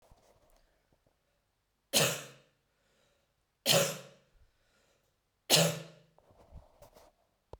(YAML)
three_cough_length: 7.6 s
three_cough_amplitude: 12260
three_cough_signal_mean_std_ratio: 0.27
survey_phase: beta (2021-08-13 to 2022-03-07)
age: 18-44
gender: Female
wearing_mask: 'No'
symptom_none: true
smoker_status: Ex-smoker
respiratory_condition_asthma: false
respiratory_condition_other: false
recruitment_source: REACT
submission_delay: 4 days
covid_test_result: Negative
covid_test_method: RT-qPCR
influenza_a_test_result: Negative
influenza_b_test_result: Negative